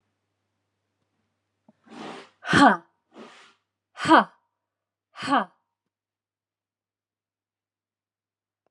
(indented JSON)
{
  "exhalation_length": "8.7 s",
  "exhalation_amplitude": 26965,
  "exhalation_signal_mean_std_ratio": 0.21,
  "survey_phase": "beta (2021-08-13 to 2022-03-07)",
  "age": "65+",
  "gender": "Female",
  "wearing_mask": "No",
  "symptom_none": true,
  "smoker_status": "Never smoked",
  "respiratory_condition_asthma": false,
  "respiratory_condition_other": false,
  "recruitment_source": "REACT",
  "submission_delay": "1 day",
  "covid_test_result": "Negative",
  "covid_test_method": "RT-qPCR",
  "influenza_a_test_result": "Negative",
  "influenza_b_test_result": "Negative"
}